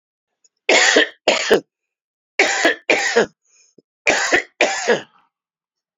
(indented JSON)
{
  "three_cough_length": "6.0 s",
  "three_cough_amplitude": 32767,
  "three_cough_signal_mean_std_ratio": 0.47,
  "survey_phase": "alpha (2021-03-01 to 2021-08-12)",
  "age": "45-64",
  "gender": "Male",
  "wearing_mask": "No",
  "symptom_cough_any": true,
  "symptom_new_continuous_cough": true,
  "symptom_abdominal_pain": true,
  "symptom_fatigue": true,
  "symptom_headache": true,
  "symptom_change_to_sense_of_smell_or_taste": true,
  "symptom_loss_of_taste": true,
  "smoker_status": "Never smoked",
  "respiratory_condition_asthma": false,
  "respiratory_condition_other": false,
  "recruitment_source": "Test and Trace",
  "submission_delay": "14 days",
  "covid_test_result": "Negative",
  "covid_test_method": "RT-qPCR"
}